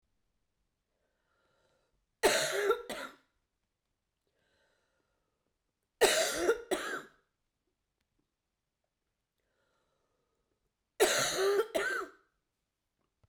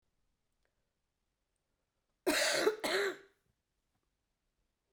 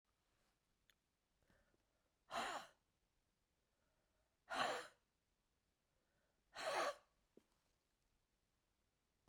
three_cough_length: 13.3 s
three_cough_amplitude: 9681
three_cough_signal_mean_std_ratio: 0.34
cough_length: 4.9 s
cough_amplitude: 4570
cough_signal_mean_std_ratio: 0.33
exhalation_length: 9.3 s
exhalation_amplitude: 1231
exhalation_signal_mean_std_ratio: 0.28
survey_phase: beta (2021-08-13 to 2022-03-07)
age: 45-64
gender: Female
wearing_mask: 'No'
symptom_cough_any: true
symptom_sore_throat: true
symptom_fatigue: true
symptom_headache: true
symptom_change_to_sense_of_smell_or_taste: true
symptom_loss_of_taste: true
symptom_onset: 5 days
smoker_status: Ex-smoker
respiratory_condition_asthma: false
respiratory_condition_other: false
recruitment_source: Test and Trace
submission_delay: 2 days
covid_test_result: Positive
covid_test_method: RT-qPCR
covid_ct_value: 16.0
covid_ct_gene: ORF1ab gene
covid_ct_mean: 16.3
covid_viral_load: 4400000 copies/ml
covid_viral_load_category: High viral load (>1M copies/ml)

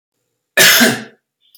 cough_length: 1.6 s
cough_amplitude: 32768
cough_signal_mean_std_ratio: 0.43
survey_phase: beta (2021-08-13 to 2022-03-07)
age: 45-64
gender: Male
wearing_mask: 'No'
symptom_none: true
smoker_status: Ex-smoker
respiratory_condition_asthma: false
respiratory_condition_other: false
recruitment_source: REACT
submission_delay: 2 days
covid_test_result: Negative
covid_test_method: RT-qPCR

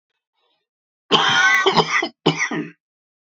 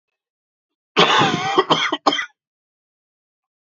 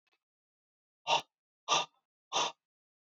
three_cough_length: 3.3 s
three_cough_amplitude: 28781
three_cough_signal_mean_std_ratio: 0.51
cough_length: 3.7 s
cough_amplitude: 32647
cough_signal_mean_std_ratio: 0.42
exhalation_length: 3.1 s
exhalation_amplitude: 5714
exhalation_signal_mean_std_ratio: 0.3
survey_phase: beta (2021-08-13 to 2022-03-07)
age: 18-44
gender: Male
wearing_mask: 'No'
symptom_cough_any: true
symptom_runny_or_blocked_nose: true
symptom_headache: true
symptom_change_to_sense_of_smell_or_taste: true
symptom_onset: 4 days
smoker_status: Ex-smoker
respiratory_condition_asthma: false
respiratory_condition_other: false
recruitment_source: Test and Trace
submission_delay: 2 days
covid_test_result: Positive
covid_test_method: RT-qPCR
covid_ct_value: 16.1
covid_ct_gene: ORF1ab gene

